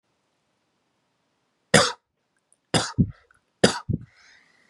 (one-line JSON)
{"three_cough_length": "4.7 s", "three_cough_amplitude": 32198, "three_cough_signal_mean_std_ratio": 0.25, "survey_phase": "beta (2021-08-13 to 2022-03-07)", "age": "18-44", "gender": "Male", "wearing_mask": "No", "symptom_none": true, "smoker_status": "Never smoked", "respiratory_condition_asthma": false, "respiratory_condition_other": false, "recruitment_source": "Test and Trace", "submission_delay": "1 day", "covid_test_result": "Positive", "covid_test_method": "RT-qPCR", "covid_ct_value": 23.2, "covid_ct_gene": "ORF1ab gene", "covid_ct_mean": 23.5, "covid_viral_load": "20000 copies/ml", "covid_viral_load_category": "Low viral load (10K-1M copies/ml)"}